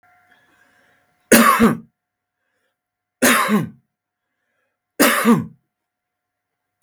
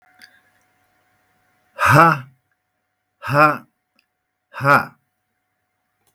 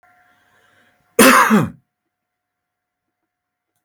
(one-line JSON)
{"three_cough_length": "6.8 s", "three_cough_amplitude": 32768, "three_cough_signal_mean_std_ratio": 0.35, "exhalation_length": "6.1 s", "exhalation_amplitude": 32768, "exhalation_signal_mean_std_ratio": 0.3, "cough_length": "3.8 s", "cough_amplitude": 32768, "cough_signal_mean_std_ratio": 0.29, "survey_phase": "beta (2021-08-13 to 2022-03-07)", "age": "45-64", "gender": "Male", "wearing_mask": "No", "symptom_none": true, "smoker_status": "Never smoked", "respiratory_condition_asthma": false, "respiratory_condition_other": false, "recruitment_source": "REACT", "submission_delay": "5 days", "covid_test_result": "Negative", "covid_test_method": "RT-qPCR", "influenza_a_test_result": "Negative", "influenza_b_test_result": "Negative"}